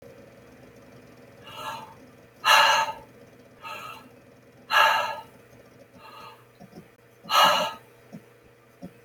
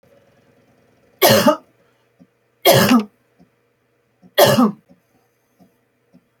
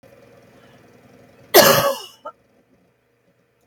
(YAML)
exhalation_length: 9.0 s
exhalation_amplitude: 19710
exhalation_signal_mean_std_ratio: 0.37
three_cough_length: 6.4 s
three_cough_amplitude: 32768
three_cough_signal_mean_std_ratio: 0.34
cough_length: 3.7 s
cough_amplitude: 32767
cough_signal_mean_std_ratio: 0.27
survey_phase: beta (2021-08-13 to 2022-03-07)
age: 65+
gender: Female
wearing_mask: 'No'
symptom_none: true
smoker_status: Never smoked
respiratory_condition_asthma: false
respiratory_condition_other: false
recruitment_source: REACT
submission_delay: 1 day
covid_test_result: Negative
covid_test_method: RT-qPCR